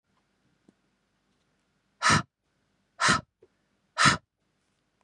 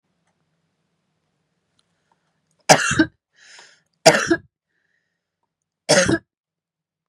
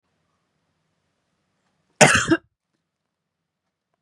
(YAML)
exhalation_length: 5.0 s
exhalation_amplitude: 14755
exhalation_signal_mean_std_ratio: 0.26
three_cough_length: 7.1 s
three_cough_amplitude: 32768
three_cough_signal_mean_std_ratio: 0.25
cough_length: 4.0 s
cough_amplitude: 32768
cough_signal_mean_std_ratio: 0.21
survey_phase: beta (2021-08-13 to 2022-03-07)
age: 18-44
gender: Female
wearing_mask: 'No'
symptom_runny_or_blocked_nose: true
symptom_sore_throat: true
symptom_fatigue: true
symptom_headache: true
symptom_other: true
smoker_status: Never smoked
respiratory_condition_asthma: false
respiratory_condition_other: false
recruitment_source: REACT
submission_delay: 1 day
covid_test_result: Positive
covid_test_method: RT-qPCR
covid_ct_value: 30.7
covid_ct_gene: E gene
influenza_a_test_result: Negative
influenza_b_test_result: Negative